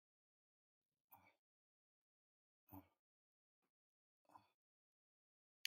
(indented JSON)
{
  "exhalation_length": "5.7 s",
  "exhalation_amplitude": 2123,
  "exhalation_signal_mean_std_ratio": 0.1,
  "survey_phase": "beta (2021-08-13 to 2022-03-07)",
  "age": "18-44",
  "gender": "Male",
  "wearing_mask": "No",
  "symptom_none": true,
  "smoker_status": "Never smoked",
  "respiratory_condition_asthma": false,
  "respiratory_condition_other": false,
  "recruitment_source": "REACT",
  "submission_delay": "1 day",
  "covid_test_result": "Negative",
  "covid_test_method": "RT-qPCR",
  "influenza_a_test_result": "Negative",
  "influenza_b_test_result": "Negative"
}